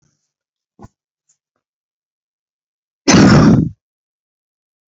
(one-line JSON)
{"cough_length": "4.9 s", "cough_amplitude": 32767, "cough_signal_mean_std_ratio": 0.3, "survey_phase": "beta (2021-08-13 to 2022-03-07)", "age": "18-44", "gender": "Male", "wearing_mask": "No", "symptom_cough_any": true, "symptom_new_continuous_cough": true, "symptom_runny_or_blocked_nose": true, "symptom_shortness_of_breath": true, "symptom_sore_throat": true, "symptom_fatigue": true, "symptom_headache": true, "symptom_change_to_sense_of_smell_or_taste": true, "symptom_loss_of_taste": true, "smoker_status": "Never smoked", "respiratory_condition_asthma": false, "respiratory_condition_other": false, "recruitment_source": "Test and Trace", "submission_delay": "2 days", "covid_test_result": "Positive", "covid_test_method": "LFT"}